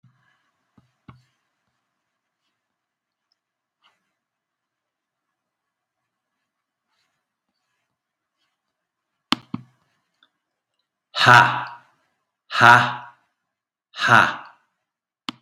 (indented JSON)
{
  "exhalation_length": "15.4 s",
  "exhalation_amplitude": 32768,
  "exhalation_signal_mean_std_ratio": 0.2,
  "survey_phase": "beta (2021-08-13 to 2022-03-07)",
  "age": "65+",
  "gender": "Male",
  "wearing_mask": "No",
  "symptom_none": true,
  "smoker_status": "Never smoked",
  "respiratory_condition_asthma": false,
  "respiratory_condition_other": false,
  "recruitment_source": "REACT",
  "submission_delay": "2 days",
  "covid_test_result": "Negative",
  "covid_test_method": "RT-qPCR",
  "influenza_a_test_result": "Negative",
  "influenza_b_test_result": "Negative"
}